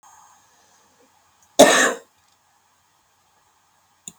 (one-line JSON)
{"cough_length": "4.2 s", "cough_amplitude": 32768, "cough_signal_mean_std_ratio": 0.22, "survey_phase": "beta (2021-08-13 to 2022-03-07)", "age": "45-64", "gender": "Female", "wearing_mask": "No", "symptom_none": true, "smoker_status": "Current smoker (11 or more cigarettes per day)", "respiratory_condition_asthma": false, "respiratory_condition_other": false, "recruitment_source": "REACT", "submission_delay": "1 day", "covid_test_result": "Negative", "covid_test_method": "RT-qPCR", "influenza_a_test_result": "Negative", "influenza_b_test_result": "Negative"}